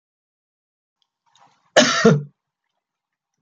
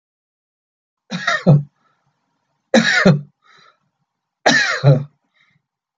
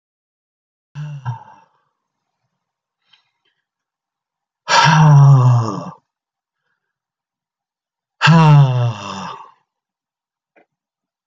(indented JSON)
{
  "cough_length": "3.4 s",
  "cough_amplitude": 28772,
  "cough_signal_mean_std_ratio": 0.27,
  "three_cough_length": "6.0 s",
  "three_cough_amplitude": 28382,
  "three_cough_signal_mean_std_ratio": 0.37,
  "exhalation_length": "11.3 s",
  "exhalation_amplitude": 29829,
  "exhalation_signal_mean_std_ratio": 0.36,
  "survey_phase": "beta (2021-08-13 to 2022-03-07)",
  "age": "65+",
  "gender": "Male",
  "wearing_mask": "No",
  "symptom_none": true,
  "smoker_status": "Never smoked",
  "respiratory_condition_asthma": false,
  "respiratory_condition_other": false,
  "recruitment_source": "REACT",
  "submission_delay": "1 day",
  "covid_test_result": "Negative",
  "covid_test_method": "RT-qPCR",
  "influenza_a_test_result": "Negative",
  "influenza_b_test_result": "Negative"
}